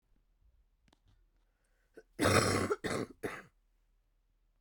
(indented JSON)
{
  "cough_length": "4.6 s",
  "cough_amplitude": 7317,
  "cough_signal_mean_std_ratio": 0.35,
  "survey_phase": "beta (2021-08-13 to 2022-03-07)",
  "age": "18-44",
  "gender": "Female",
  "wearing_mask": "No",
  "symptom_cough_any": true,
  "symptom_runny_or_blocked_nose": true,
  "symptom_shortness_of_breath": true,
  "symptom_onset": "6 days",
  "smoker_status": "Never smoked",
  "respiratory_condition_asthma": true,
  "respiratory_condition_other": false,
  "recruitment_source": "REACT",
  "submission_delay": "6 days",
  "covid_test_result": "Negative",
  "covid_test_method": "RT-qPCR",
  "influenza_a_test_result": "Negative",
  "influenza_b_test_result": "Negative"
}